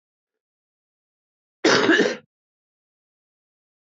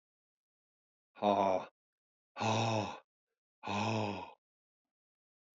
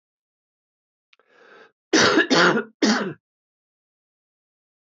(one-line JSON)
{"cough_length": "3.9 s", "cough_amplitude": 24265, "cough_signal_mean_std_ratio": 0.28, "exhalation_length": "5.5 s", "exhalation_amplitude": 5069, "exhalation_signal_mean_std_ratio": 0.42, "three_cough_length": "4.9 s", "three_cough_amplitude": 25045, "three_cough_signal_mean_std_ratio": 0.35, "survey_phase": "beta (2021-08-13 to 2022-03-07)", "age": "65+", "gender": "Male", "wearing_mask": "No", "symptom_cough_any": true, "symptom_runny_or_blocked_nose": true, "symptom_fatigue": true, "symptom_fever_high_temperature": true, "symptom_headache": true, "symptom_other": true, "symptom_onset": "3 days", "smoker_status": "Never smoked", "respiratory_condition_asthma": false, "respiratory_condition_other": false, "recruitment_source": "Test and Trace", "submission_delay": "2 days", "covid_test_result": "Positive", "covid_test_method": "RT-qPCR", "covid_ct_value": 15.3, "covid_ct_gene": "ORF1ab gene", "covid_ct_mean": 15.7, "covid_viral_load": "6900000 copies/ml", "covid_viral_load_category": "High viral load (>1M copies/ml)"}